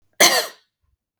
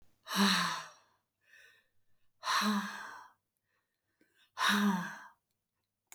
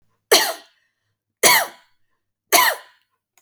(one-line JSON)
{"cough_length": "1.2 s", "cough_amplitude": 32452, "cough_signal_mean_std_ratio": 0.35, "exhalation_length": "6.1 s", "exhalation_amplitude": 5241, "exhalation_signal_mean_std_ratio": 0.43, "three_cough_length": "3.4 s", "three_cough_amplitude": 32768, "three_cough_signal_mean_std_ratio": 0.34, "survey_phase": "beta (2021-08-13 to 2022-03-07)", "age": "45-64", "gender": "Female", "wearing_mask": "No", "symptom_none": true, "smoker_status": "Never smoked", "respiratory_condition_asthma": false, "respiratory_condition_other": false, "recruitment_source": "REACT", "submission_delay": "1 day", "covid_test_result": "Negative", "covid_test_method": "RT-qPCR"}